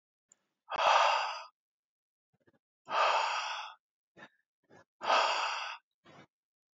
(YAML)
exhalation_length: 6.7 s
exhalation_amplitude: 7363
exhalation_signal_mean_std_ratio: 0.44
survey_phase: beta (2021-08-13 to 2022-03-07)
age: 18-44
gender: Female
wearing_mask: 'No'
symptom_runny_or_blocked_nose: true
symptom_sore_throat: true
symptom_onset: 3 days
smoker_status: Ex-smoker
respiratory_condition_asthma: false
respiratory_condition_other: false
recruitment_source: REACT
submission_delay: 0 days
covid_test_result: Negative
covid_test_method: RT-qPCR
influenza_a_test_result: Negative
influenza_b_test_result: Negative